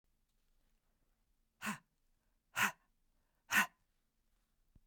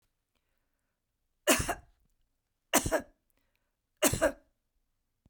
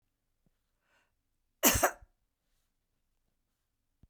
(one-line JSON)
{"exhalation_length": "4.9 s", "exhalation_amplitude": 4758, "exhalation_signal_mean_std_ratio": 0.22, "three_cough_length": "5.3 s", "three_cough_amplitude": 12129, "three_cough_signal_mean_std_ratio": 0.27, "cough_length": "4.1 s", "cough_amplitude": 12778, "cough_signal_mean_std_ratio": 0.19, "survey_phase": "beta (2021-08-13 to 2022-03-07)", "age": "65+", "gender": "Female", "wearing_mask": "No", "symptom_sore_throat": true, "symptom_onset": "2 days", "smoker_status": "Ex-smoker", "respiratory_condition_asthma": false, "respiratory_condition_other": false, "recruitment_source": "Test and Trace", "submission_delay": "1 day", "covid_test_result": "Negative", "covid_test_method": "RT-qPCR"}